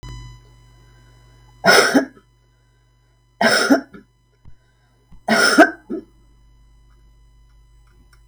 {"three_cough_length": "8.3 s", "three_cough_amplitude": 32768, "three_cough_signal_mean_std_ratio": 0.33, "survey_phase": "beta (2021-08-13 to 2022-03-07)", "age": "65+", "gender": "Female", "wearing_mask": "No", "symptom_none": true, "smoker_status": "Never smoked", "respiratory_condition_asthma": false, "respiratory_condition_other": false, "recruitment_source": "REACT", "submission_delay": "2 days", "covid_test_result": "Negative", "covid_test_method": "RT-qPCR"}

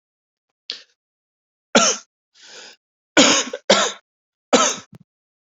{"three_cough_length": "5.5 s", "three_cough_amplitude": 32768, "three_cough_signal_mean_std_ratio": 0.33, "survey_phase": "beta (2021-08-13 to 2022-03-07)", "age": "18-44", "gender": "Male", "wearing_mask": "No", "symptom_none": true, "smoker_status": "Never smoked", "respiratory_condition_asthma": false, "respiratory_condition_other": false, "recruitment_source": "REACT", "submission_delay": "1 day", "covid_test_result": "Negative", "covid_test_method": "RT-qPCR", "influenza_a_test_result": "Negative", "influenza_b_test_result": "Negative"}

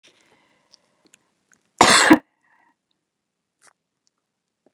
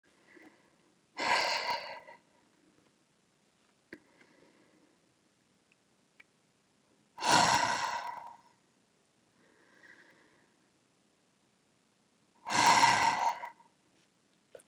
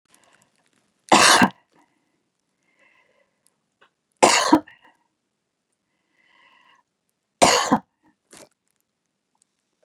{"cough_length": "4.7 s", "cough_amplitude": 32768, "cough_signal_mean_std_ratio": 0.21, "exhalation_length": "14.7 s", "exhalation_amplitude": 8590, "exhalation_signal_mean_std_ratio": 0.32, "three_cough_length": "9.8 s", "three_cough_amplitude": 32671, "three_cough_signal_mean_std_ratio": 0.24, "survey_phase": "beta (2021-08-13 to 2022-03-07)", "age": "65+", "gender": "Female", "wearing_mask": "No", "symptom_none": true, "smoker_status": "Never smoked", "respiratory_condition_asthma": false, "respiratory_condition_other": false, "recruitment_source": "REACT", "submission_delay": "1 day", "covid_test_result": "Negative", "covid_test_method": "RT-qPCR", "influenza_a_test_result": "Negative", "influenza_b_test_result": "Negative"}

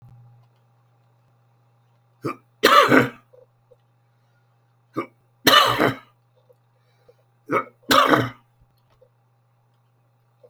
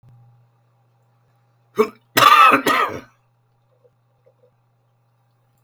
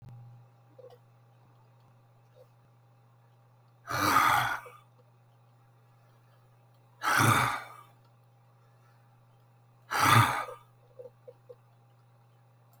{"three_cough_length": "10.5 s", "three_cough_amplitude": 32768, "three_cough_signal_mean_std_ratio": 0.29, "cough_length": "5.6 s", "cough_amplitude": 32768, "cough_signal_mean_std_ratio": 0.29, "exhalation_length": "12.8 s", "exhalation_amplitude": 12287, "exhalation_signal_mean_std_ratio": 0.33, "survey_phase": "beta (2021-08-13 to 2022-03-07)", "age": "65+", "gender": "Male", "wearing_mask": "No", "symptom_cough_any": true, "symptom_runny_or_blocked_nose": true, "symptom_onset": "5 days", "smoker_status": "Ex-smoker", "respiratory_condition_asthma": false, "respiratory_condition_other": false, "recruitment_source": "REACT", "submission_delay": "1 day", "covid_test_result": "Negative", "covid_test_method": "RT-qPCR", "influenza_a_test_result": "Negative", "influenza_b_test_result": "Negative"}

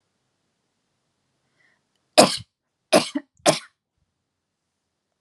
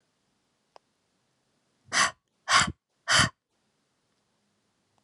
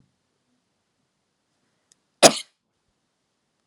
{"three_cough_length": "5.2 s", "three_cough_amplitude": 32689, "three_cough_signal_mean_std_ratio": 0.2, "exhalation_length": "5.0 s", "exhalation_amplitude": 16348, "exhalation_signal_mean_std_ratio": 0.26, "cough_length": "3.7 s", "cough_amplitude": 32768, "cough_signal_mean_std_ratio": 0.12, "survey_phase": "alpha (2021-03-01 to 2021-08-12)", "age": "18-44", "gender": "Female", "wearing_mask": "No", "symptom_abdominal_pain": true, "symptom_fatigue": true, "symptom_onset": "3 days", "smoker_status": "Never smoked", "respiratory_condition_asthma": false, "respiratory_condition_other": false, "recruitment_source": "REACT", "submission_delay": "2 days", "covid_test_result": "Negative", "covid_test_method": "RT-qPCR"}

